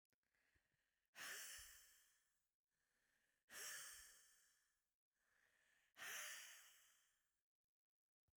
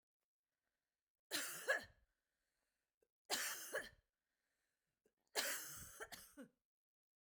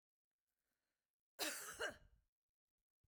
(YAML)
exhalation_length: 8.4 s
exhalation_amplitude: 269
exhalation_signal_mean_std_ratio: 0.43
three_cough_length: 7.3 s
three_cough_amplitude: 1746
three_cough_signal_mean_std_ratio: 0.36
cough_length: 3.1 s
cough_amplitude: 1086
cough_signal_mean_std_ratio: 0.32
survey_phase: beta (2021-08-13 to 2022-03-07)
age: 45-64
gender: Female
wearing_mask: 'No'
symptom_none: true
symptom_onset: 5 days
smoker_status: Never smoked
respiratory_condition_asthma: false
respiratory_condition_other: false
recruitment_source: REACT
submission_delay: 1 day
covid_test_result: Negative
covid_test_method: RT-qPCR
influenza_a_test_result: Negative
influenza_b_test_result: Negative